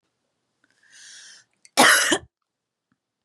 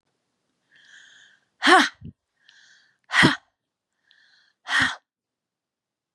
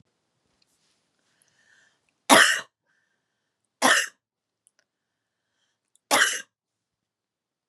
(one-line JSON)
{"cough_length": "3.2 s", "cough_amplitude": 31697, "cough_signal_mean_std_ratio": 0.28, "exhalation_length": "6.1 s", "exhalation_amplitude": 25674, "exhalation_signal_mean_std_ratio": 0.26, "three_cough_length": "7.7 s", "three_cough_amplitude": 32767, "three_cough_signal_mean_std_ratio": 0.24, "survey_phase": "beta (2021-08-13 to 2022-03-07)", "age": "18-44", "gender": "Female", "wearing_mask": "No", "symptom_cough_any": true, "symptom_new_continuous_cough": true, "symptom_sore_throat": true, "symptom_fatigue": true, "symptom_headache": true, "symptom_other": true, "symptom_onset": "3 days", "smoker_status": "Ex-smoker", "respiratory_condition_asthma": false, "respiratory_condition_other": false, "recruitment_source": "Test and Trace", "submission_delay": "1 day", "covid_test_result": "Positive", "covid_test_method": "RT-qPCR", "covid_ct_value": 28.3, "covid_ct_gene": "N gene"}